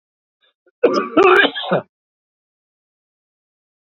{
  "cough_length": "3.9 s",
  "cough_amplitude": 28470,
  "cough_signal_mean_std_ratio": 0.34,
  "survey_phase": "beta (2021-08-13 to 2022-03-07)",
  "age": "65+",
  "gender": "Male",
  "wearing_mask": "No",
  "symptom_none": true,
  "smoker_status": "Ex-smoker",
  "respiratory_condition_asthma": false,
  "respiratory_condition_other": false,
  "recruitment_source": "REACT",
  "submission_delay": "4 days",
  "covid_test_result": "Negative",
  "covid_test_method": "RT-qPCR",
  "influenza_a_test_result": "Negative",
  "influenza_b_test_result": "Positive",
  "influenza_b_ct_value": 34.5
}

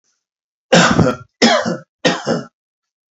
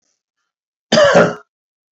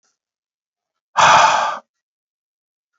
{
  "three_cough_length": "3.2 s",
  "three_cough_amplitude": 32768,
  "three_cough_signal_mean_std_ratio": 0.47,
  "cough_length": "2.0 s",
  "cough_amplitude": 32398,
  "cough_signal_mean_std_ratio": 0.38,
  "exhalation_length": "3.0 s",
  "exhalation_amplitude": 30849,
  "exhalation_signal_mean_std_ratio": 0.35,
  "survey_phase": "beta (2021-08-13 to 2022-03-07)",
  "age": "45-64",
  "gender": "Male",
  "wearing_mask": "No",
  "symptom_none": true,
  "smoker_status": "Never smoked",
  "respiratory_condition_asthma": false,
  "respiratory_condition_other": false,
  "recruitment_source": "REACT",
  "submission_delay": "2 days",
  "covid_test_result": "Negative",
  "covid_test_method": "RT-qPCR",
  "influenza_a_test_result": "Negative",
  "influenza_b_test_result": "Negative"
}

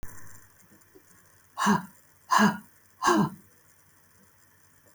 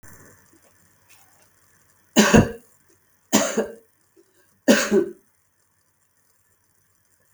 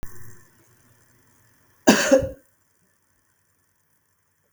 {
  "exhalation_length": "4.9 s",
  "exhalation_amplitude": 13631,
  "exhalation_signal_mean_std_ratio": 0.36,
  "three_cough_length": "7.3 s",
  "three_cough_amplitude": 32768,
  "three_cough_signal_mean_std_ratio": 0.28,
  "cough_length": "4.5 s",
  "cough_amplitude": 32768,
  "cough_signal_mean_std_ratio": 0.25,
  "survey_phase": "beta (2021-08-13 to 2022-03-07)",
  "age": "65+",
  "gender": "Female",
  "wearing_mask": "No",
  "symptom_cough_any": true,
  "smoker_status": "Ex-smoker",
  "respiratory_condition_asthma": false,
  "respiratory_condition_other": false,
  "recruitment_source": "REACT",
  "submission_delay": "2 days",
  "covid_test_result": "Negative",
  "covid_test_method": "RT-qPCR",
  "influenza_a_test_result": "Negative",
  "influenza_b_test_result": "Negative"
}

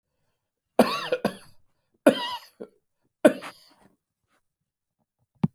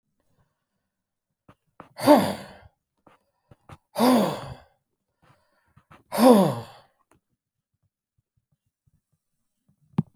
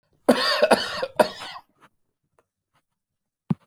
{
  "three_cough_length": "5.5 s",
  "three_cough_amplitude": 26371,
  "three_cough_signal_mean_std_ratio": 0.23,
  "exhalation_length": "10.2 s",
  "exhalation_amplitude": 24571,
  "exhalation_signal_mean_std_ratio": 0.26,
  "cough_length": "3.7 s",
  "cough_amplitude": 25961,
  "cough_signal_mean_std_ratio": 0.34,
  "survey_phase": "beta (2021-08-13 to 2022-03-07)",
  "age": "65+",
  "gender": "Male",
  "wearing_mask": "No",
  "symptom_none": true,
  "smoker_status": "Never smoked",
  "respiratory_condition_asthma": false,
  "respiratory_condition_other": false,
  "recruitment_source": "REACT",
  "submission_delay": "1 day",
  "covid_test_result": "Negative",
  "covid_test_method": "RT-qPCR"
}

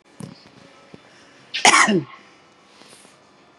{
  "cough_length": "3.6 s",
  "cough_amplitude": 32508,
  "cough_signal_mean_std_ratio": 0.3,
  "survey_phase": "beta (2021-08-13 to 2022-03-07)",
  "age": "45-64",
  "gender": "Female",
  "wearing_mask": "No",
  "symptom_none": true,
  "smoker_status": "Never smoked",
  "respiratory_condition_asthma": false,
  "respiratory_condition_other": false,
  "recruitment_source": "REACT",
  "submission_delay": "2 days",
  "covid_test_result": "Negative",
  "covid_test_method": "RT-qPCR",
  "influenza_a_test_result": "Negative",
  "influenza_b_test_result": "Negative"
}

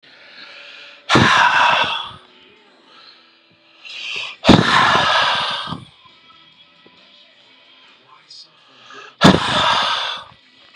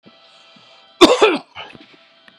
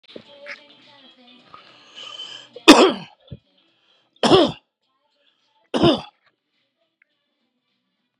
{
  "exhalation_length": "10.8 s",
  "exhalation_amplitude": 32768,
  "exhalation_signal_mean_std_ratio": 0.45,
  "cough_length": "2.4 s",
  "cough_amplitude": 32768,
  "cough_signal_mean_std_ratio": 0.31,
  "three_cough_length": "8.2 s",
  "three_cough_amplitude": 32768,
  "three_cough_signal_mean_std_ratio": 0.24,
  "survey_phase": "beta (2021-08-13 to 2022-03-07)",
  "age": "45-64",
  "gender": "Male",
  "wearing_mask": "No",
  "symptom_cough_any": true,
  "symptom_fatigue": true,
  "symptom_fever_high_temperature": true,
  "symptom_headache": true,
  "symptom_other": true,
  "symptom_onset": "3 days",
  "smoker_status": "Ex-smoker",
  "respiratory_condition_asthma": false,
  "respiratory_condition_other": false,
  "recruitment_source": "Test and Trace",
  "submission_delay": "2 days",
  "covid_test_result": "Positive",
  "covid_test_method": "RT-qPCR",
  "covid_ct_value": 21.3,
  "covid_ct_gene": "ORF1ab gene"
}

